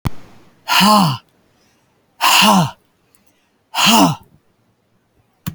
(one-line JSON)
{"exhalation_length": "5.5 s", "exhalation_amplitude": 32768, "exhalation_signal_mean_std_ratio": 0.44, "survey_phase": "beta (2021-08-13 to 2022-03-07)", "age": "65+", "gender": "Female", "wearing_mask": "No", "symptom_none": true, "smoker_status": "Ex-smoker", "respiratory_condition_asthma": false, "respiratory_condition_other": false, "recruitment_source": "REACT", "submission_delay": "2 days", "covid_test_result": "Negative", "covid_test_method": "RT-qPCR"}